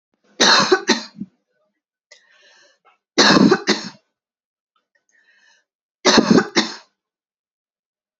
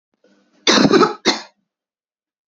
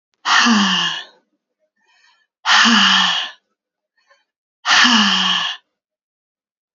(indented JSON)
{
  "three_cough_length": "8.2 s",
  "three_cough_amplitude": 32567,
  "three_cough_signal_mean_std_ratio": 0.34,
  "cough_length": "2.5 s",
  "cough_amplitude": 29607,
  "cough_signal_mean_std_ratio": 0.38,
  "exhalation_length": "6.7 s",
  "exhalation_amplitude": 30478,
  "exhalation_signal_mean_std_ratio": 0.51,
  "survey_phase": "beta (2021-08-13 to 2022-03-07)",
  "age": "18-44",
  "gender": "Female",
  "wearing_mask": "No",
  "symptom_runny_or_blocked_nose": true,
  "symptom_fatigue": true,
  "symptom_headache": true,
  "smoker_status": "Never smoked",
  "respiratory_condition_asthma": false,
  "respiratory_condition_other": false,
  "recruitment_source": "Test and Trace",
  "submission_delay": "2 days",
  "covid_test_result": "Negative",
  "covid_test_method": "RT-qPCR"
}